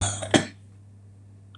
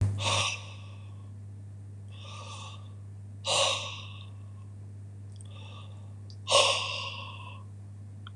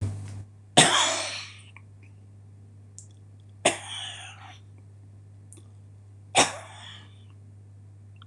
{"cough_length": "1.6 s", "cough_amplitude": 25545, "cough_signal_mean_std_ratio": 0.38, "exhalation_length": "8.4 s", "exhalation_amplitude": 13812, "exhalation_signal_mean_std_ratio": 0.63, "three_cough_length": "8.3 s", "three_cough_amplitude": 26027, "three_cough_signal_mean_std_ratio": 0.37, "survey_phase": "beta (2021-08-13 to 2022-03-07)", "age": "65+", "gender": "Male", "wearing_mask": "No", "symptom_none": true, "smoker_status": "Ex-smoker", "respiratory_condition_asthma": true, "respiratory_condition_other": true, "recruitment_source": "REACT", "submission_delay": "8 days", "covid_test_result": "Negative", "covid_test_method": "RT-qPCR", "influenza_a_test_result": "Negative", "influenza_b_test_result": "Negative"}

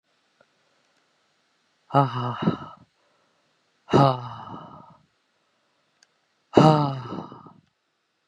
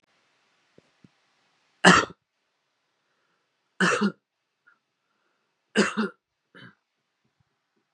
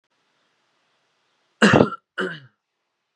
{"exhalation_length": "8.3 s", "exhalation_amplitude": 30587, "exhalation_signal_mean_std_ratio": 0.29, "three_cough_length": "7.9 s", "three_cough_amplitude": 32277, "three_cough_signal_mean_std_ratio": 0.22, "cough_length": "3.2 s", "cough_amplitude": 32726, "cough_signal_mean_std_ratio": 0.25, "survey_phase": "beta (2021-08-13 to 2022-03-07)", "age": "18-44", "gender": "Male", "wearing_mask": "No", "symptom_cough_any": true, "symptom_runny_or_blocked_nose": true, "symptom_sore_throat": true, "symptom_headache": true, "symptom_change_to_sense_of_smell_or_taste": true, "symptom_loss_of_taste": true, "smoker_status": "Never smoked", "respiratory_condition_asthma": false, "respiratory_condition_other": false, "recruitment_source": "Test and Trace", "submission_delay": "2 days", "covid_test_result": "Positive", "covid_test_method": "LFT"}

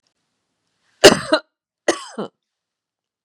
{"cough_length": "3.2 s", "cough_amplitude": 32768, "cough_signal_mean_std_ratio": 0.22, "survey_phase": "beta (2021-08-13 to 2022-03-07)", "age": "65+", "gender": "Female", "wearing_mask": "No", "symptom_none": true, "smoker_status": "Ex-smoker", "respiratory_condition_asthma": false, "respiratory_condition_other": false, "recruitment_source": "REACT", "submission_delay": "3 days", "covid_test_result": "Negative", "covid_test_method": "RT-qPCR", "influenza_a_test_result": "Negative", "influenza_b_test_result": "Negative"}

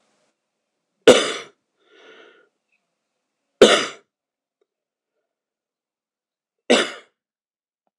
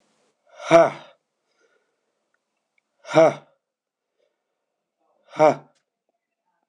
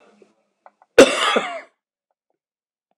{"three_cough_length": "8.0 s", "three_cough_amplitude": 26028, "three_cough_signal_mean_std_ratio": 0.2, "exhalation_length": "6.7 s", "exhalation_amplitude": 26028, "exhalation_signal_mean_std_ratio": 0.23, "cough_length": "3.0 s", "cough_amplitude": 26028, "cough_signal_mean_std_ratio": 0.26, "survey_phase": "alpha (2021-03-01 to 2021-08-12)", "age": "45-64", "gender": "Male", "wearing_mask": "No", "symptom_headache": true, "symptom_onset": "4 days", "smoker_status": "Ex-smoker", "respiratory_condition_asthma": false, "respiratory_condition_other": false, "recruitment_source": "Test and Trace", "submission_delay": "2 days", "covid_test_result": "Positive", "covid_test_method": "RT-qPCR"}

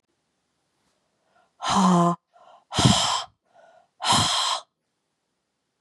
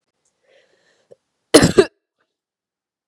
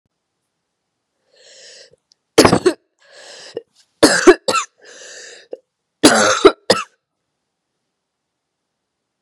{"exhalation_length": "5.8 s", "exhalation_amplitude": 21625, "exhalation_signal_mean_std_ratio": 0.43, "cough_length": "3.1 s", "cough_amplitude": 32768, "cough_signal_mean_std_ratio": 0.21, "three_cough_length": "9.2 s", "three_cough_amplitude": 32768, "three_cough_signal_mean_std_ratio": 0.28, "survey_phase": "beta (2021-08-13 to 2022-03-07)", "age": "18-44", "gender": "Female", "wearing_mask": "No", "symptom_cough_any": true, "symptom_runny_or_blocked_nose": true, "symptom_sore_throat": true, "symptom_fatigue": true, "symptom_headache": true, "smoker_status": "Never smoked", "respiratory_condition_asthma": false, "respiratory_condition_other": false, "recruitment_source": "Test and Trace", "submission_delay": "1 day", "covid_test_result": "Positive", "covid_test_method": "LFT"}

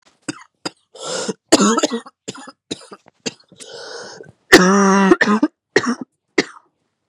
{"cough_length": "7.1 s", "cough_amplitude": 32768, "cough_signal_mean_std_ratio": 0.41, "survey_phase": "beta (2021-08-13 to 2022-03-07)", "age": "18-44", "gender": "Female", "wearing_mask": "No", "symptom_cough_any": true, "symptom_runny_or_blocked_nose": true, "symptom_shortness_of_breath": true, "symptom_headache": true, "symptom_change_to_sense_of_smell_or_taste": true, "symptom_other": true, "symptom_onset": "3 days", "smoker_status": "Ex-smoker", "respiratory_condition_asthma": true, "respiratory_condition_other": false, "recruitment_source": "Test and Trace", "submission_delay": "1 day", "covid_test_result": "Positive", "covid_test_method": "RT-qPCR", "covid_ct_value": 22.6, "covid_ct_gene": "ORF1ab gene"}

